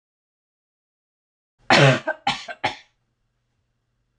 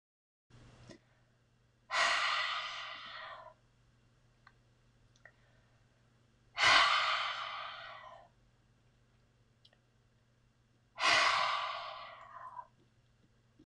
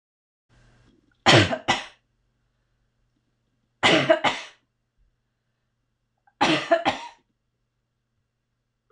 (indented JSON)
{
  "cough_length": "4.2 s",
  "cough_amplitude": 26028,
  "cough_signal_mean_std_ratio": 0.27,
  "exhalation_length": "13.7 s",
  "exhalation_amplitude": 8245,
  "exhalation_signal_mean_std_ratio": 0.38,
  "three_cough_length": "8.9 s",
  "three_cough_amplitude": 24332,
  "three_cough_signal_mean_std_ratio": 0.29,
  "survey_phase": "beta (2021-08-13 to 2022-03-07)",
  "age": "45-64",
  "gender": "Female",
  "wearing_mask": "No",
  "symptom_none": true,
  "smoker_status": "Ex-smoker",
  "respiratory_condition_asthma": false,
  "respiratory_condition_other": false,
  "recruitment_source": "REACT",
  "submission_delay": "0 days",
  "covid_test_result": "Negative",
  "covid_test_method": "RT-qPCR",
  "influenza_a_test_result": "Negative",
  "influenza_b_test_result": "Negative"
}